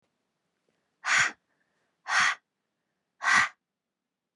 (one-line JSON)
{"exhalation_length": "4.4 s", "exhalation_amplitude": 10305, "exhalation_signal_mean_std_ratio": 0.33, "survey_phase": "beta (2021-08-13 to 2022-03-07)", "age": "18-44", "gender": "Female", "wearing_mask": "No", "symptom_cough_any": true, "symptom_new_continuous_cough": true, "symptom_runny_or_blocked_nose": true, "symptom_sore_throat": true, "symptom_fatigue": true, "symptom_headache": true, "smoker_status": "Never smoked", "respiratory_condition_asthma": false, "respiratory_condition_other": false, "recruitment_source": "Test and Trace", "submission_delay": "1 day", "covid_test_result": "Negative", "covid_test_method": "RT-qPCR"}